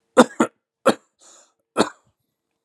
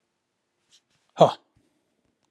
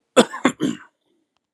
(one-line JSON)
{"three_cough_length": "2.6 s", "three_cough_amplitude": 32591, "three_cough_signal_mean_std_ratio": 0.24, "exhalation_length": "2.3 s", "exhalation_amplitude": 26019, "exhalation_signal_mean_std_ratio": 0.16, "cough_length": "1.5 s", "cough_amplitude": 32494, "cough_signal_mean_std_ratio": 0.31, "survey_phase": "alpha (2021-03-01 to 2021-08-12)", "age": "45-64", "gender": "Male", "wearing_mask": "No", "symptom_none": true, "smoker_status": "Ex-smoker", "respiratory_condition_asthma": false, "respiratory_condition_other": false, "recruitment_source": "REACT", "submission_delay": "2 days", "covid_test_result": "Negative", "covid_test_method": "RT-qPCR"}